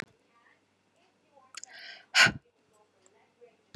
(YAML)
exhalation_length: 3.8 s
exhalation_amplitude: 14686
exhalation_signal_mean_std_ratio: 0.2
survey_phase: beta (2021-08-13 to 2022-03-07)
age: 45-64
gender: Female
wearing_mask: 'No'
symptom_runny_or_blocked_nose: true
symptom_change_to_sense_of_smell_or_taste: true
symptom_loss_of_taste: true
smoker_status: Ex-smoker
respiratory_condition_asthma: false
respiratory_condition_other: false
recruitment_source: Test and Trace
submission_delay: 2 days
covid_test_result: Positive
covid_test_method: RT-qPCR
covid_ct_value: 16.8
covid_ct_gene: ORF1ab gene
covid_ct_mean: 17.9
covid_viral_load: 1300000 copies/ml
covid_viral_load_category: High viral load (>1M copies/ml)